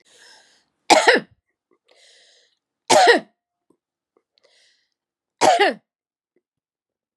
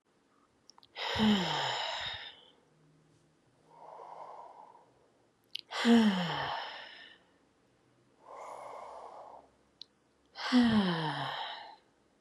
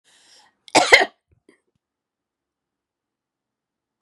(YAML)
three_cough_length: 7.2 s
three_cough_amplitude: 32767
three_cough_signal_mean_std_ratio: 0.28
exhalation_length: 12.2 s
exhalation_amplitude: 6641
exhalation_signal_mean_std_ratio: 0.44
cough_length: 4.0 s
cough_amplitude: 32768
cough_signal_mean_std_ratio: 0.19
survey_phase: beta (2021-08-13 to 2022-03-07)
age: 45-64
gender: Female
wearing_mask: 'No'
symptom_none: true
smoker_status: Never smoked
respiratory_condition_asthma: true
respiratory_condition_other: false
recruitment_source: REACT
submission_delay: 2 days
covid_test_result: Negative
covid_test_method: RT-qPCR
influenza_a_test_result: Negative
influenza_b_test_result: Negative